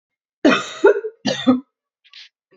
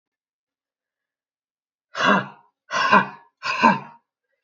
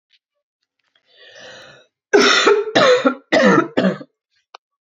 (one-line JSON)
{"cough_length": "2.6 s", "cough_amplitude": 27278, "cough_signal_mean_std_ratio": 0.4, "exhalation_length": "4.4 s", "exhalation_amplitude": 26333, "exhalation_signal_mean_std_ratio": 0.35, "three_cough_length": "4.9 s", "three_cough_amplitude": 32767, "three_cough_signal_mean_std_ratio": 0.47, "survey_phase": "beta (2021-08-13 to 2022-03-07)", "age": "18-44", "gender": "Female", "wearing_mask": "No", "symptom_cough_any": true, "symptom_new_continuous_cough": true, "symptom_runny_or_blocked_nose": true, "symptom_sore_throat": true, "symptom_fatigue": true, "symptom_onset": "4 days", "smoker_status": "Never smoked", "respiratory_condition_asthma": false, "respiratory_condition_other": false, "recruitment_source": "Test and Trace", "submission_delay": "2 days", "covid_test_result": "Positive", "covid_test_method": "RT-qPCR", "covid_ct_value": 19.4, "covid_ct_gene": "ORF1ab gene"}